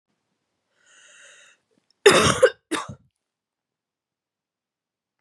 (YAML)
cough_length: 5.2 s
cough_amplitude: 29091
cough_signal_mean_std_ratio: 0.23
survey_phase: beta (2021-08-13 to 2022-03-07)
age: 18-44
gender: Female
wearing_mask: 'No'
symptom_cough_any: true
symptom_runny_or_blocked_nose: true
symptom_shortness_of_breath: true
symptom_sore_throat: true
symptom_fatigue: true
symptom_fever_high_temperature: true
symptom_headache: true
smoker_status: Never smoked
respiratory_condition_asthma: false
respiratory_condition_other: false
recruitment_source: Test and Trace
submission_delay: 2 days
covid_test_result: Positive
covid_test_method: RT-qPCR
covid_ct_value: 24.3
covid_ct_gene: ORF1ab gene
covid_ct_mean: 24.4
covid_viral_load: 10000 copies/ml
covid_viral_load_category: Minimal viral load (< 10K copies/ml)